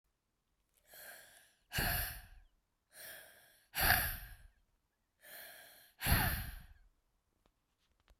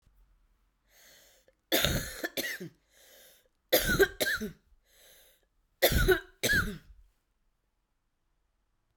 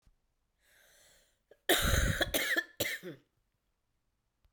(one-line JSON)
{"exhalation_length": "8.2 s", "exhalation_amplitude": 6852, "exhalation_signal_mean_std_ratio": 0.36, "three_cough_length": "9.0 s", "three_cough_amplitude": 12267, "three_cough_signal_mean_std_ratio": 0.36, "cough_length": "4.5 s", "cough_amplitude": 7372, "cough_signal_mean_std_ratio": 0.4, "survey_phase": "beta (2021-08-13 to 2022-03-07)", "age": "45-64", "gender": "Female", "wearing_mask": "No", "symptom_cough_any": true, "symptom_runny_or_blocked_nose": true, "symptom_sore_throat": true, "symptom_fatigue": true, "symptom_headache": true, "symptom_change_to_sense_of_smell_or_taste": true, "symptom_loss_of_taste": true, "symptom_other": true, "symptom_onset": "3 days", "smoker_status": "Ex-smoker", "respiratory_condition_asthma": true, "respiratory_condition_other": false, "recruitment_source": "Test and Trace", "submission_delay": "2 days", "covid_test_result": "Positive", "covid_test_method": "RT-qPCR", "covid_ct_value": 21.7, "covid_ct_gene": "ORF1ab gene"}